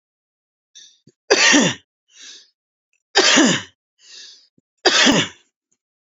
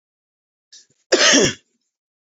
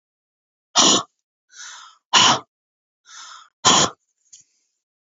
{
  "three_cough_length": "6.1 s",
  "three_cough_amplitude": 32767,
  "three_cough_signal_mean_std_ratio": 0.39,
  "cough_length": "2.3 s",
  "cough_amplitude": 30080,
  "cough_signal_mean_std_ratio": 0.34,
  "exhalation_length": "5.0 s",
  "exhalation_amplitude": 30972,
  "exhalation_signal_mean_std_ratio": 0.32,
  "survey_phase": "beta (2021-08-13 to 2022-03-07)",
  "age": "18-44",
  "gender": "Female",
  "wearing_mask": "No",
  "symptom_abdominal_pain": true,
  "symptom_diarrhoea": true,
  "symptom_fatigue": true,
  "symptom_onset": "12 days",
  "smoker_status": "Ex-smoker",
  "respiratory_condition_asthma": true,
  "respiratory_condition_other": false,
  "recruitment_source": "REACT",
  "submission_delay": "1 day",
  "covid_test_result": "Negative",
  "covid_test_method": "RT-qPCR",
  "influenza_a_test_result": "Negative",
  "influenza_b_test_result": "Negative"
}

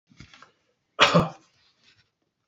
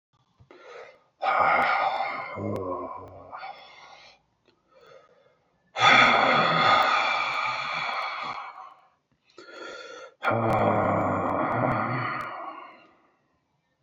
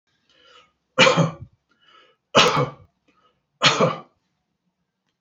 {
  "cough_length": "2.5 s",
  "cough_amplitude": 25674,
  "cough_signal_mean_std_ratio": 0.27,
  "exhalation_length": "13.8 s",
  "exhalation_amplitude": 20337,
  "exhalation_signal_mean_std_ratio": 0.58,
  "three_cough_length": "5.2 s",
  "three_cough_amplitude": 28190,
  "three_cough_signal_mean_std_ratio": 0.34,
  "survey_phase": "beta (2021-08-13 to 2022-03-07)",
  "age": "65+",
  "gender": "Male",
  "wearing_mask": "No",
  "symptom_none": true,
  "smoker_status": "Never smoked",
  "respiratory_condition_asthma": false,
  "respiratory_condition_other": false,
  "recruitment_source": "REACT",
  "submission_delay": "1 day",
  "covid_test_result": "Negative",
  "covid_test_method": "RT-qPCR"
}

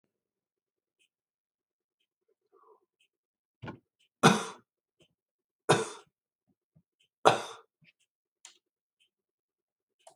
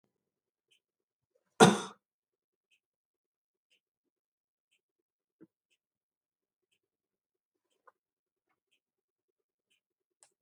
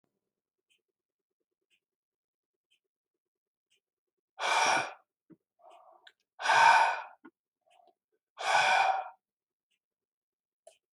{
  "three_cough_length": "10.2 s",
  "three_cough_amplitude": 27234,
  "three_cough_signal_mean_std_ratio": 0.17,
  "cough_length": "10.4 s",
  "cough_amplitude": 17618,
  "cough_signal_mean_std_ratio": 0.1,
  "exhalation_length": "10.9 s",
  "exhalation_amplitude": 9623,
  "exhalation_signal_mean_std_ratio": 0.31,
  "survey_phase": "beta (2021-08-13 to 2022-03-07)",
  "age": "65+",
  "gender": "Male",
  "wearing_mask": "No",
  "symptom_cough_any": true,
  "smoker_status": "Ex-smoker",
  "respiratory_condition_asthma": false,
  "respiratory_condition_other": false,
  "recruitment_source": "REACT",
  "submission_delay": "5 days",
  "covid_test_result": "Negative",
  "covid_test_method": "RT-qPCR"
}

